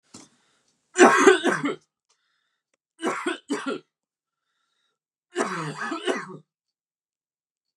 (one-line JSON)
{"three_cough_length": "7.8 s", "three_cough_amplitude": 28655, "three_cough_signal_mean_std_ratio": 0.32, "survey_phase": "beta (2021-08-13 to 2022-03-07)", "age": "18-44", "gender": "Male", "wearing_mask": "No", "symptom_runny_or_blocked_nose": true, "symptom_sore_throat": true, "symptom_onset": "4 days", "smoker_status": "Never smoked", "respiratory_condition_asthma": false, "respiratory_condition_other": false, "recruitment_source": "REACT", "submission_delay": "3 days", "covid_test_result": "Negative", "covid_test_method": "RT-qPCR", "influenza_a_test_result": "Negative", "influenza_b_test_result": "Negative"}